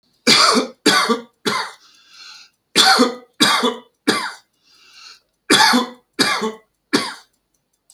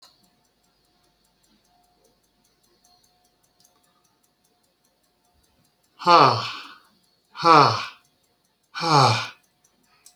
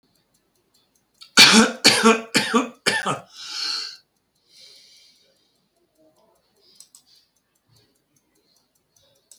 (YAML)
three_cough_length: 7.9 s
three_cough_amplitude: 32767
three_cough_signal_mean_std_ratio: 0.48
exhalation_length: 10.2 s
exhalation_amplitude: 27293
exhalation_signal_mean_std_ratio: 0.26
cough_length: 9.4 s
cough_amplitude: 32517
cough_signal_mean_std_ratio: 0.29
survey_phase: beta (2021-08-13 to 2022-03-07)
age: 65+
gender: Male
wearing_mask: 'No'
symptom_none: true
smoker_status: Never smoked
respiratory_condition_asthma: false
respiratory_condition_other: false
recruitment_source: REACT
submission_delay: 15 days
covid_test_result: Negative
covid_test_method: RT-qPCR